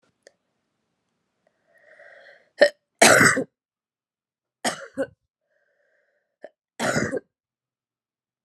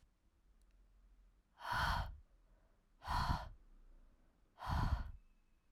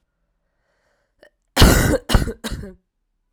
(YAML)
three_cough_length: 8.4 s
three_cough_amplitude: 31750
three_cough_signal_mean_std_ratio: 0.24
exhalation_length: 5.7 s
exhalation_amplitude: 1769
exhalation_signal_mean_std_ratio: 0.44
cough_length: 3.3 s
cough_amplitude: 32768
cough_signal_mean_std_ratio: 0.34
survey_phase: alpha (2021-03-01 to 2021-08-12)
age: 18-44
gender: Female
wearing_mask: 'No'
symptom_cough_any: true
symptom_onset: 6 days
smoker_status: Never smoked
respiratory_condition_asthma: true
respiratory_condition_other: false
recruitment_source: Test and Trace
submission_delay: 2 days
covid_test_result: Positive
covid_test_method: RT-qPCR
covid_ct_value: 30.7
covid_ct_gene: ORF1ab gene
covid_ct_mean: 32.4
covid_viral_load: 24 copies/ml
covid_viral_load_category: Minimal viral load (< 10K copies/ml)